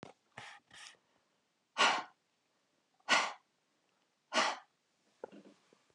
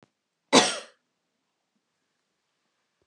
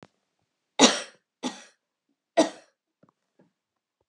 {
  "exhalation_length": "5.9 s",
  "exhalation_amplitude": 5940,
  "exhalation_signal_mean_std_ratio": 0.28,
  "cough_length": "3.1 s",
  "cough_amplitude": 24532,
  "cough_signal_mean_std_ratio": 0.19,
  "three_cough_length": "4.1 s",
  "three_cough_amplitude": 25226,
  "three_cough_signal_mean_std_ratio": 0.21,
  "survey_phase": "beta (2021-08-13 to 2022-03-07)",
  "age": "65+",
  "gender": "Female",
  "wearing_mask": "No",
  "symptom_none": true,
  "smoker_status": "Never smoked",
  "respiratory_condition_asthma": false,
  "respiratory_condition_other": false,
  "recruitment_source": "REACT",
  "submission_delay": "1 day",
  "covid_test_result": "Negative",
  "covid_test_method": "RT-qPCR"
}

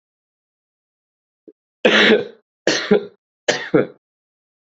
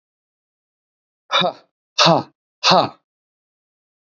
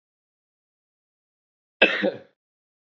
{
  "three_cough_length": "4.6 s",
  "three_cough_amplitude": 28207,
  "three_cough_signal_mean_std_ratio": 0.35,
  "exhalation_length": "4.0 s",
  "exhalation_amplitude": 29492,
  "exhalation_signal_mean_std_ratio": 0.31,
  "cough_length": "2.9 s",
  "cough_amplitude": 27189,
  "cough_signal_mean_std_ratio": 0.22,
  "survey_phase": "beta (2021-08-13 to 2022-03-07)",
  "age": "18-44",
  "gender": "Male",
  "wearing_mask": "No",
  "symptom_cough_any": true,
  "symptom_sore_throat": true,
  "symptom_onset": "4 days",
  "smoker_status": "Never smoked",
  "respiratory_condition_asthma": false,
  "respiratory_condition_other": false,
  "recruitment_source": "REACT",
  "submission_delay": "1 day",
  "covid_test_result": "Positive",
  "covid_test_method": "RT-qPCR",
  "covid_ct_value": 27.0,
  "covid_ct_gene": "E gene",
  "influenza_a_test_result": "Unknown/Void",
  "influenza_b_test_result": "Unknown/Void"
}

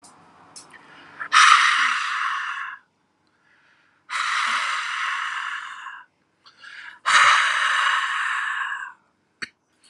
{
  "exhalation_length": "9.9 s",
  "exhalation_amplitude": 31056,
  "exhalation_signal_mean_std_ratio": 0.54,
  "survey_phase": "alpha (2021-03-01 to 2021-08-12)",
  "age": "45-64",
  "gender": "Male",
  "wearing_mask": "No",
  "symptom_cough_any": true,
  "symptom_fatigue": true,
  "symptom_change_to_sense_of_smell_or_taste": true,
  "symptom_onset": "7 days",
  "smoker_status": "Never smoked",
  "respiratory_condition_asthma": false,
  "respiratory_condition_other": false,
  "recruitment_source": "Test and Trace",
  "submission_delay": "3 days",
  "covid_test_result": "Positive",
  "covid_test_method": "RT-qPCR",
  "covid_ct_value": 14.1,
  "covid_ct_gene": "ORF1ab gene",
  "covid_ct_mean": 14.4,
  "covid_viral_load": "19000000 copies/ml",
  "covid_viral_load_category": "High viral load (>1M copies/ml)"
}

